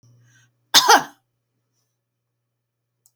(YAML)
cough_length: 3.2 s
cough_amplitude: 32767
cough_signal_mean_std_ratio: 0.22
survey_phase: beta (2021-08-13 to 2022-03-07)
age: 65+
gender: Female
wearing_mask: 'No'
symptom_none: true
smoker_status: Never smoked
respiratory_condition_asthma: false
respiratory_condition_other: false
recruitment_source: REACT
submission_delay: 3 days
covid_test_result: Negative
covid_test_method: RT-qPCR